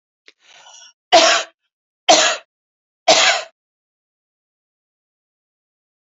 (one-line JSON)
{"three_cough_length": "6.1 s", "three_cough_amplitude": 31068, "three_cough_signal_mean_std_ratio": 0.31, "survey_phase": "beta (2021-08-13 to 2022-03-07)", "age": "45-64", "gender": "Female", "wearing_mask": "No", "symptom_none": true, "smoker_status": "Ex-smoker", "respiratory_condition_asthma": false, "respiratory_condition_other": false, "recruitment_source": "REACT", "submission_delay": "1 day", "covid_test_result": "Negative", "covid_test_method": "RT-qPCR", "influenza_a_test_result": "Unknown/Void", "influenza_b_test_result": "Unknown/Void"}